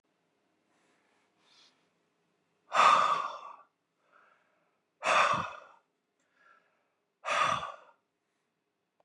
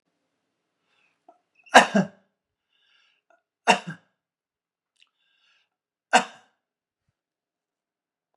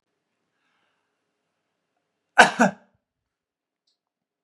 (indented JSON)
{
  "exhalation_length": "9.0 s",
  "exhalation_amplitude": 10130,
  "exhalation_signal_mean_std_ratio": 0.31,
  "three_cough_length": "8.4 s",
  "three_cough_amplitude": 32767,
  "three_cough_signal_mean_std_ratio": 0.16,
  "cough_length": "4.4 s",
  "cough_amplitude": 32767,
  "cough_signal_mean_std_ratio": 0.16,
  "survey_phase": "beta (2021-08-13 to 2022-03-07)",
  "age": "65+",
  "gender": "Male",
  "wearing_mask": "No",
  "symptom_fatigue": true,
  "smoker_status": "Ex-smoker",
  "respiratory_condition_asthma": false,
  "respiratory_condition_other": false,
  "recruitment_source": "REACT",
  "submission_delay": "2 days",
  "covid_test_result": "Negative",
  "covid_test_method": "RT-qPCR",
  "influenza_a_test_result": "Negative",
  "influenza_b_test_result": "Negative"
}